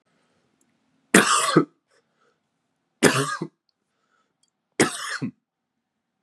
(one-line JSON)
{"three_cough_length": "6.2 s", "three_cough_amplitude": 32621, "three_cough_signal_mean_std_ratio": 0.3, "survey_phase": "beta (2021-08-13 to 2022-03-07)", "age": "18-44", "gender": "Male", "wearing_mask": "No", "symptom_cough_any": true, "symptom_headache": true, "symptom_onset": "9 days", "smoker_status": "Never smoked", "respiratory_condition_asthma": false, "respiratory_condition_other": false, "recruitment_source": "Test and Trace", "submission_delay": "6 days", "covid_test_result": "Negative", "covid_test_method": "ePCR"}